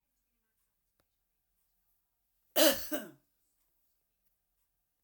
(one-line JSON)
{"cough_length": "5.0 s", "cough_amplitude": 9275, "cough_signal_mean_std_ratio": 0.2, "survey_phase": "alpha (2021-03-01 to 2021-08-12)", "age": "45-64", "gender": "Female", "wearing_mask": "Yes", "symptom_fatigue": true, "smoker_status": "Ex-smoker", "respiratory_condition_asthma": false, "respiratory_condition_other": false, "recruitment_source": "REACT", "submission_delay": "5 days", "covid_test_result": "Negative", "covid_test_method": "RT-qPCR"}